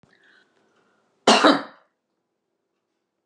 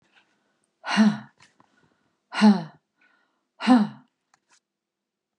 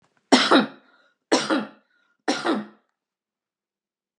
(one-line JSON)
{"cough_length": "3.3 s", "cough_amplitude": 29683, "cough_signal_mean_std_ratio": 0.24, "exhalation_length": "5.4 s", "exhalation_amplitude": 19228, "exhalation_signal_mean_std_ratio": 0.3, "three_cough_length": "4.2 s", "three_cough_amplitude": 30728, "three_cough_signal_mean_std_ratio": 0.35, "survey_phase": "beta (2021-08-13 to 2022-03-07)", "age": "65+", "gender": "Female", "wearing_mask": "No", "symptom_cough_any": true, "symptom_onset": "12 days", "smoker_status": "Ex-smoker", "respiratory_condition_asthma": false, "respiratory_condition_other": false, "recruitment_source": "REACT", "submission_delay": "1 day", "covid_test_result": "Negative", "covid_test_method": "RT-qPCR", "influenza_a_test_result": "Negative", "influenza_b_test_result": "Negative"}